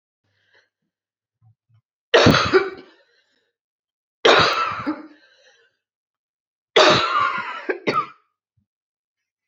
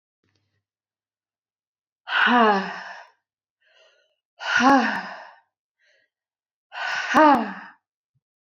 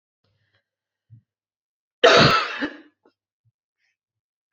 three_cough_length: 9.5 s
three_cough_amplitude: 32767
three_cough_signal_mean_std_ratio: 0.36
exhalation_length: 8.4 s
exhalation_amplitude: 25160
exhalation_signal_mean_std_ratio: 0.36
cough_length: 4.5 s
cough_amplitude: 28465
cough_signal_mean_std_ratio: 0.26
survey_phase: beta (2021-08-13 to 2022-03-07)
age: 18-44
gender: Female
wearing_mask: 'No'
symptom_cough_any: true
symptom_runny_or_blocked_nose: true
symptom_sore_throat: true
symptom_fatigue: true
symptom_onset: 3 days
smoker_status: Never smoked
respiratory_condition_asthma: true
respiratory_condition_other: false
recruitment_source: Test and Trace
submission_delay: 2 days
covid_test_result: Positive
covid_test_method: ePCR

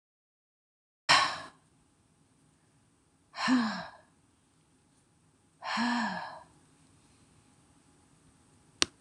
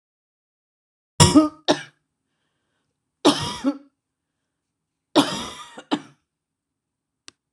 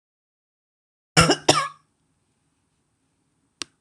exhalation_length: 9.0 s
exhalation_amplitude: 25445
exhalation_signal_mean_std_ratio: 0.31
three_cough_length: 7.5 s
three_cough_amplitude: 26028
three_cough_signal_mean_std_ratio: 0.26
cough_length: 3.8 s
cough_amplitude: 26028
cough_signal_mean_std_ratio: 0.23
survey_phase: alpha (2021-03-01 to 2021-08-12)
age: 45-64
gender: Female
wearing_mask: 'No'
symptom_none: true
smoker_status: Ex-smoker
respiratory_condition_asthma: false
respiratory_condition_other: false
recruitment_source: REACT
submission_delay: 2 days
covid_test_result: Negative
covid_test_method: RT-qPCR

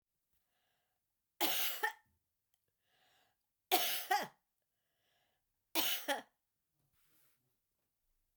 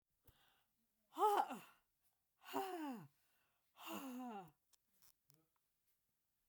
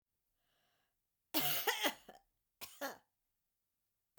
three_cough_length: 8.4 s
three_cough_amplitude: 5269
three_cough_signal_mean_std_ratio: 0.32
exhalation_length: 6.5 s
exhalation_amplitude: 1803
exhalation_signal_mean_std_ratio: 0.34
cough_length: 4.2 s
cough_amplitude: 3636
cough_signal_mean_std_ratio: 0.32
survey_phase: beta (2021-08-13 to 2022-03-07)
age: 65+
gender: Female
wearing_mask: 'No'
symptom_none: true
symptom_onset: 12 days
smoker_status: Never smoked
respiratory_condition_asthma: false
respiratory_condition_other: false
recruitment_source: REACT
submission_delay: 8 days
covid_test_result: Negative
covid_test_method: RT-qPCR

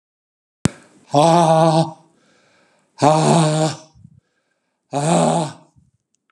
exhalation_length: 6.3 s
exhalation_amplitude: 32768
exhalation_signal_mean_std_ratio: 0.45
survey_phase: beta (2021-08-13 to 2022-03-07)
age: 65+
gender: Male
wearing_mask: 'No'
symptom_none: true
smoker_status: Never smoked
respiratory_condition_asthma: false
respiratory_condition_other: false
recruitment_source: REACT
submission_delay: 7 days
covid_test_result: Negative
covid_test_method: RT-qPCR
influenza_a_test_result: Negative
influenza_b_test_result: Negative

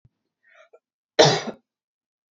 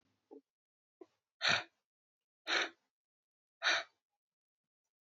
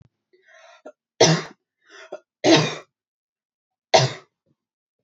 cough_length: 2.3 s
cough_amplitude: 27850
cough_signal_mean_std_ratio: 0.24
exhalation_length: 5.1 s
exhalation_amplitude: 4114
exhalation_signal_mean_std_ratio: 0.27
three_cough_length: 5.0 s
three_cough_amplitude: 27274
three_cough_signal_mean_std_ratio: 0.29
survey_phase: beta (2021-08-13 to 2022-03-07)
age: 18-44
gender: Female
wearing_mask: 'No'
symptom_none: true
symptom_onset: 10 days
smoker_status: Never smoked
respiratory_condition_asthma: false
respiratory_condition_other: false
recruitment_source: REACT
submission_delay: 4 days
covid_test_result: Negative
covid_test_method: RT-qPCR
influenza_a_test_result: Negative
influenza_b_test_result: Negative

